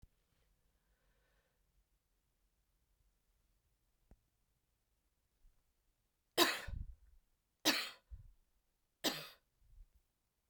{
  "three_cough_length": "10.5 s",
  "three_cough_amplitude": 5847,
  "three_cough_signal_mean_std_ratio": 0.21,
  "survey_phase": "beta (2021-08-13 to 2022-03-07)",
  "age": "45-64",
  "gender": "Female",
  "wearing_mask": "No",
  "symptom_cough_any": true,
  "symptom_runny_or_blocked_nose": true,
  "symptom_sore_throat": true,
  "symptom_fatigue": true,
  "smoker_status": "Never smoked",
  "respiratory_condition_asthma": false,
  "respiratory_condition_other": false,
  "recruitment_source": "Test and Trace",
  "submission_delay": "2 days",
  "covid_test_result": "Positive",
  "covid_test_method": "RT-qPCR",
  "covid_ct_value": 16.7,
  "covid_ct_gene": "ORF1ab gene",
  "covid_ct_mean": 17.3,
  "covid_viral_load": "2100000 copies/ml",
  "covid_viral_load_category": "High viral load (>1M copies/ml)"
}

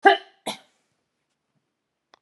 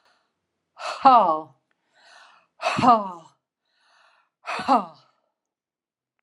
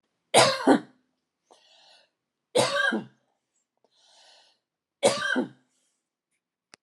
{
  "cough_length": "2.2 s",
  "cough_amplitude": 27816,
  "cough_signal_mean_std_ratio": 0.19,
  "exhalation_length": "6.2 s",
  "exhalation_amplitude": 25992,
  "exhalation_signal_mean_std_ratio": 0.31,
  "three_cough_length": "6.8 s",
  "three_cough_amplitude": 20017,
  "three_cough_signal_mean_std_ratio": 0.32,
  "survey_phase": "beta (2021-08-13 to 2022-03-07)",
  "age": "65+",
  "gender": "Female",
  "wearing_mask": "No",
  "symptom_none": true,
  "smoker_status": "Never smoked",
  "respiratory_condition_asthma": false,
  "respiratory_condition_other": false,
  "recruitment_source": "REACT",
  "submission_delay": "1 day",
  "covid_test_result": "Negative",
  "covid_test_method": "RT-qPCR"
}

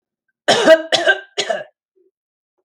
{
  "three_cough_length": "2.6 s",
  "three_cough_amplitude": 32479,
  "three_cough_signal_mean_std_ratio": 0.4,
  "survey_phase": "beta (2021-08-13 to 2022-03-07)",
  "age": "45-64",
  "gender": "Female",
  "wearing_mask": "No",
  "symptom_cough_any": true,
  "symptom_onset": "11 days",
  "smoker_status": "Never smoked",
  "respiratory_condition_asthma": true,
  "respiratory_condition_other": false,
  "recruitment_source": "REACT",
  "submission_delay": "2 days",
  "covid_test_result": "Negative",
  "covid_test_method": "RT-qPCR"
}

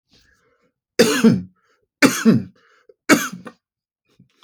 {
  "three_cough_length": "4.4 s",
  "three_cough_amplitude": 31504,
  "three_cough_signal_mean_std_ratio": 0.35,
  "survey_phase": "alpha (2021-03-01 to 2021-08-12)",
  "age": "45-64",
  "gender": "Male",
  "wearing_mask": "No",
  "symptom_none": true,
  "smoker_status": "Never smoked",
  "respiratory_condition_asthma": false,
  "respiratory_condition_other": false,
  "recruitment_source": "REACT",
  "submission_delay": "1 day",
  "covid_test_result": "Negative",
  "covid_test_method": "RT-qPCR"
}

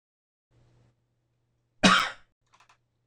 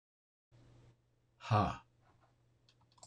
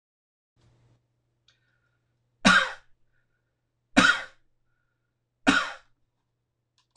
{
  "cough_length": "3.1 s",
  "cough_amplitude": 19636,
  "cough_signal_mean_std_ratio": 0.22,
  "exhalation_length": "3.1 s",
  "exhalation_amplitude": 3097,
  "exhalation_signal_mean_std_ratio": 0.26,
  "three_cough_length": "7.0 s",
  "three_cough_amplitude": 21462,
  "three_cough_signal_mean_std_ratio": 0.24,
  "survey_phase": "alpha (2021-03-01 to 2021-08-12)",
  "age": "45-64",
  "gender": "Male",
  "wearing_mask": "No",
  "symptom_none": true,
  "smoker_status": "Ex-smoker",
  "respiratory_condition_asthma": false,
  "respiratory_condition_other": false,
  "recruitment_source": "REACT",
  "submission_delay": "1 day",
  "covid_test_result": "Negative",
  "covid_test_method": "RT-qPCR"
}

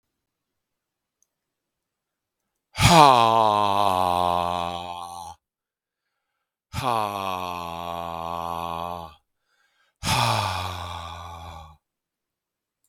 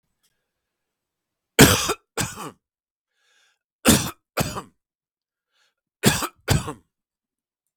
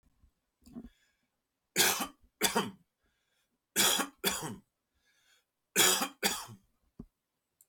{
  "exhalation_length": "12.9 s",
  "exhalation_amplitude": 32768,
  "exhalation_signal_mean_std_ratio": 0.39,
  "cough_length": "7.8 s",
  "cough_amplitude": 32768,
  "cough_signal_mean_std_ratio": 0.27,
  "three_cough_length": "7.7 s",
  "three_cough_amplitude": 9498,
  "three_cough_signal_mean_std_ratio": 0.35,
  "survey_phase": "beta (2021-08-13 to 2022-03-07)",
  "age": "45-64",
  "gender": "Male",
  "wearing_mask": "No",
  "symptom_headache": true,
  "smoker_status": "Ex-smoker",
  "respiratory_condition_asthma": false,
  "respiratory_condition_other": false,
  "recruitment_source": "REACT",
  "submission_delay": "5 days",
  "covid_test_result": "Negative",
  "covid_test_method": "RT-qPCR"
}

